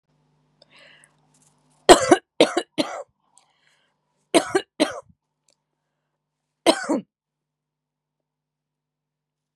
{"three_cough_length": "9.6 s", "three_cough_amplitude": 32768, "three_cough_signal_mean_std_ratio": 0.21, "survey_phase": "beta (2021-08-13 to 2022-03-07)", "age": "18-44", "gender": "Female", "wearing_mask": "No", "symptom_none": true, "smoker_status": "Current smoker (1 to 10 cigarettes per day)", "respiratory_condition_asthma": false, "respiratory_condition_other": false, "recruitment_source": "REACT", "submission_delay": "3 days", "covid_test_result": "Negative", "covid_test_method": "RT-qPCR", "influenza_a_test_result": "Negative", "influenza_b_test_result": "Negative"}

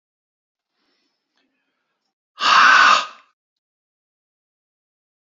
{"exhalation_length": "5.4 s", "exhalation_amplitude": 28664, "exhalation_signal_mean_std_ratio": 0.28, "survey_phase": "beta (2021-08-13 to 2022-03-07)", "age": "45-64", "gender": "Male", "wearing_mask": "No", "symptom_none": true, "smoker_status": "Current smoker (1 to 10 cigarettes per day)", "respiratory_condition_asthma": false, "respiratory_condition_other": false, "recruitment_source": "REACT", "submission_delay": "1 day", "covid_test_result": "Negative", "covid_test_method": "RT-qPCR", "influenza_a_test_result": "Negative", "influenza_b_test_result": "Negative"}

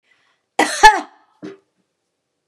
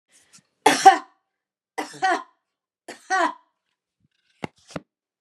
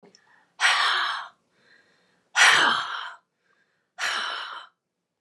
{"cough_length": "2.5 s", "cough_amplitude": 32768, "cough_signal_mean_std_ratio": 0.26, "three_cough_length": "5.2 s", "three_cough_amplitude": 32522, "three_cough_signal_mean_std_ratio": 0.26, "exhalation_length": "5.2 s", "exhalation_amplitude": 19678, "exhalation_signal_mean_std_ratio": 0.44, "survey_phase": "beta (2021-08-13 to 2022-03-07)", "age": "65+", "gender": "Female", "wearing_mask": "No", "symptom_none": true, "smoker_status": "Never smoked", "respiratory_condition_asthma": false, "respiratory_condition_other": false, "recruitment_source": "REACT", "submission_delay": "2 days", "covid_test_result": "Negative", "covid_test_method": "RT-qPCR", "influenza_a_test_result": "Negative", "influenza_b_test_result": "Negative"}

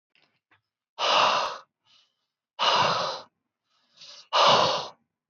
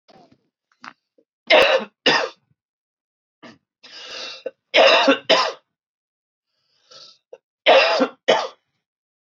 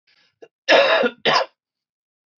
{"exhalation_length": "5.3 s", "exhalation_amplitude": 14736, "exhalation_signal_mean_std_ratio": 0.46, "three_cough_length": "9.4 s", "three_cough_amplitude": 25992, "three_cough_signal_mean_std_ratio": 0.36, "cough_length": "2.4 s", "cough_amplitude": 24421, "cough_signal_mean_std_ratio": 0.41, "survey_phase": "beta (2021-08-13 to 2022-03-07)", "age": "18-44", "gender": "Male", "wearing_mask": "No", "symptom_cough_any": true, "symptom_runny_or_blocked_nose": true, "smoker_status": "Current smoker (11 or more cigarettes per day)", "respiratory_condition_asthma": false, "respiratory_condition_other": false, "recruitment_source": "REACT", "submission_delay": "1 day", "covid_test_result": "Negative", "covid_test_method": "RT-qPCR"}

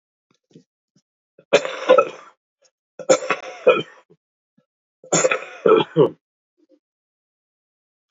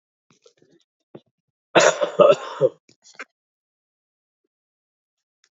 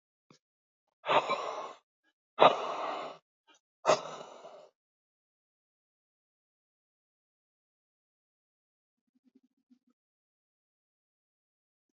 {"three_cough_length": "8.1 s", "three_cough_amplitude": 30158, "three_cough_signal_mean_std_ratio": 0.31, "cough_length": "5.5 s", "cough_amplitude": 27543, "cough_signal_mean_std_ratio": 0.25, "exhalation_length": "11.9 s", "exhalation_amplitude": 19549, "exhalation_signal_mean_std_ratio": 0.21, "survey_phase": "beta (2021-08-13 to 2022-03-07)", "age": "45-64", "gender": "Male", "wearing_mask": "No", "symptom_cough_any": true, "symptom_runny_or_blocked_nose": true, "symptom_shortness_of_breath": true, "symptom_other": true, "symptom_onset": "3 days", "smoker_status": "Ex-smoker", "respiratory_condition_asthma": false, "respiratory_condition_other": true, "recruitment_source": "Test and Trace", "submission_delay": "1 day", "covid_test_result": "Positive", "covid_test_method": "ePCR"}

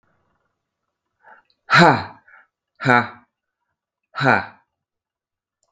{"exhalation_length": "5.7 s", "exhalation_amplitude": 32768, "exhalation_signal_mean_std_ratio": 0.27, "survey_phase": "beta (2021-08-13 to 2022-03-07)", "age": "45-64", "gender": "Male", "wearing_mask": "No", "symptom_cough_any": true, "symptom_runny_or_blocked_nose": true, "symptom_sore_throat": true, "symptom_fatigue": true, "symptom_headache": true, "symptom_change_to_sense_of_smell_or_taste": true, "smoker_status": "Current smoker (11 or more cigarettes per day)", "respiratory_condition_asthma": false, "respiratory_condition_other": false, "recruitment_source": "Test and Trace", "submission_delay": "1 day", "covid_test_result": "Negative", "covid_test_method": "RT-qPCR"}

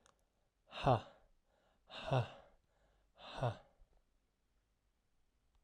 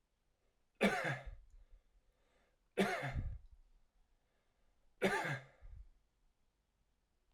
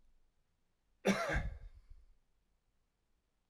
{"exhalation_length": "5.6 s", "exhalation_amplitude": 3568, "exhalation_signal_mean_std_ratio": 0.28, "three_cough_length": "7.3 s", "three_cough_amplitude": 4194, "three_cough_signal_mean_std_ratio": 0.36, "cough_length": "3.5 s", "cough_amplitude": 4056, "cough_signal_mean_std_ratio": 0.32, "survey_phase": "alpha (2021-03-01 to 2021-08-12)", "age": "18-44", "gender": "Male", "wearing_mask": "No", "symptom_none": true, "smoker_status": "Never smoked", "respiratory_condition_asthma": true, "respiratory_condition_other": false, "recruitment_source": "REACT", "submission_delay": "2 days", "covid_test_result": "Negative", "covid_test_method": "RT-qPCR"}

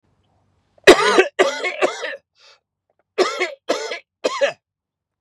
{"three_cough_length": "5.2 s", "three_cough_amplitude": 32768, "three_cough_signal_mean_std_ratio": 0.38, "survey_phase": "beta (2021-08-13 to 2022-03-07)", "age": "18-44", "gender": "Male", "wearing_mask": "No", "symptom_none": true, "symptom_onset": "8 days", "smoker_status": "Never smoked", "respiratory_condition_asthma": false, "respiratory_condition_other": false, "recruitment_source": "REACT", "submission_delay": "3 days", "covid_test_result": "Positive", "covid_test_method": "RT-qPCR", "covid_ct_value": 24.7, "covid_ct_gene": "E gene", "influenza_a_test_result": "Negative", "influenza_b_test_result": "Negative"}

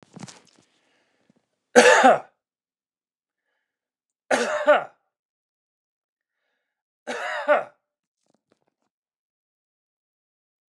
{"three_cough_length": "10.7 s", "three_cough_amplitude": 29204, "three_cough_signal_mean_std_ratio": 0.25, "survey_phase": "alpha (2021-03-01 to 2021-08-12)", "age": "45-64", "gender": "Male", "wearing_mask": "No", "symptom_none": true, "smoker_status": "Never smoked", "respiratory_condition_asthma": false, "respiratory_condition_other": false, "recruitment_source": "REACT", "submission_delay": "3 days", "covid_test_result": "Negative", "covid_test_method": "RT-qPCR"}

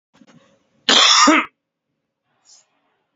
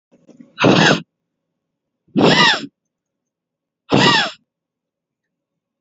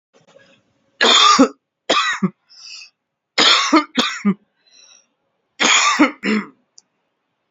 {"cough_length": "3.2 s", "cough_amplitude": 31314, "cough_signal_mean_std_ratio": 0.35, "exhalation_length": "5.8 s", "exhalation_amplitude": 32768, "exhalation_signal_mean_std_ratio": 0.38, "three_cough_length": "7.5 s", "three_cough_amplitude": 31813, "three_cough_signal_mean_std_ratio": 0.45, "survey_phase": "beta (2021-08-13 to 2022-03-07)", "age": "18-44", "gender": "Male", "wearing_mask": "No", "symptom_none": true, "symptom_onset": "3 days", "smoker_status": "Never smoked", "respiratory_condition_asthma": false, "respiratory_condition_other": false, "recruitment_source": "REACT", "submission_delay": "14 days", "covid_test_result": "Negative", "covid_test_method": "RT-qPCR", "influenza_a_test_result": "Negative", "influenza_b_test_result": "Negative"}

